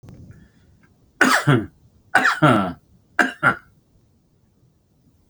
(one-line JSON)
{"three_cough_length": "5.3 s", "three_cough_amplitude": 29890, "three_cough_signal_mean_std_ratio": 0.37, "survey_phase": "beta (2021-08-13 to 2022-03-07)", "age": "45-64", "gender": "Male", "wearing_mask": "No", "symptom_none": true, "smoker_status": "Ex-smoker", "respiratory_condition_asthma": false, "respiratory_condition_other": false, "recruitment_source": "REACT", "submission_delay": "3 days", "covid_test_result": "Negative", "covid_test_method": "RT-qPCR"}